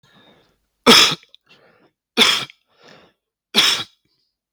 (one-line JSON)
{"three_cough_length": "4.5 s", "three_cough_amplitude": 32768, "three_cough_signal_mean_std_ratio": 0.32, "survey_phase": "beta (2021-08-13 to 2022-03-07)", "age": "45-64", "gender": "Male", "wearing_mask": "No", "symptom_none": true, "smoker_status": "Never smoked", "respiratory_condition_asthma": false, "respiratory_condition_other": false, "recruitment_source": "REACT", "submission_delay": "1 day", "covid_test_result": "Negative", "covid_test_method": "RT-qPCR", "influenza_a_test_result": "Negative", "influenza_b_test_result": "Negative"}